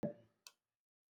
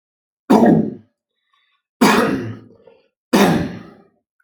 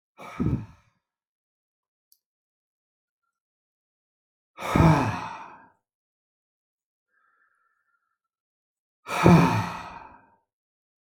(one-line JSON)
{"cough_length": "1.2 s", "cough_amplitude": 1258, "cough_signal_mean_std_ratio": 0.24, "three_cough_length": "4.4 s", "three_cough_amplitude": 32767, "three_cough_signal_mean_std_ratio": 0.44, "exhalation_length": "11.0 s", "exhalation_amplitude": 25889, "exhalation_signal_mean_std_ratio": 0.27, "survey_phase": "alpha (2021-03-01 to 2021-08-12)", "age": "45-64", "gender": "Male", "wearing_mask": "No", "symptom_none": true, "smoker_status": "Never smoked", "respiratory_condition_asthma": false, "respiratory_condition_other": false, "recruitment_source": "REACT", "submission_delay": "3 days", "covid_test_result": "Negative", "covid_test_method": "RT-qPCR"}